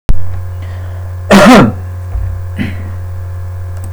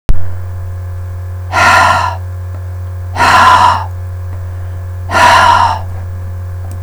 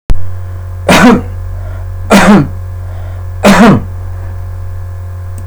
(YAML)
cough_length: 3.9 s
cough_amplitude: 32768
cough_signal_mean_std_ratio: 0.73
exhalation_length: 6.8 s
exhalation_amplitude: 32768
exhalation_signal_mean_std_ratio: 0.83
three_cough_length: 5.5 s
three_cough_amplitude: 32768
three_cough_signal_mean_std_ratio: 0.76
survey_phase: beta (2021-08-13 to 2022-03-07)
age: 65+
gender: Male
wearing_mask: 'No'
symptom_none: true
smoker_status: Never smoked
respiratory_condition_asthma: false
respiratory_condition_other: false
recruitment_source: REACT
submission_delay: 1 day
covid_test_result: Negative
covid_test_method: RT-qPCR
influenza_a_test_result: Negative
influenza_b_test_result: Negative